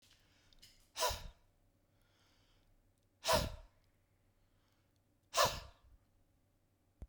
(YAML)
exhalation_length: 7.1 s
exhalation_amplitude: 4328
exhalation_signal_mean_std_ratio: 0.27
survey_phase: beta (2021-08-13 to 2022-03-07)
age: 45-64
gender: Male
wearing_mask: 'No'
symptom_none: true
smoker_status: Ex-smoker
respiratory_condition_asthma: false
respiratory_condition_other: false
recruitment_source: REACT
submission_delay: 3 days
covid_test_result: Negative
covid_test_method: RT-qPCR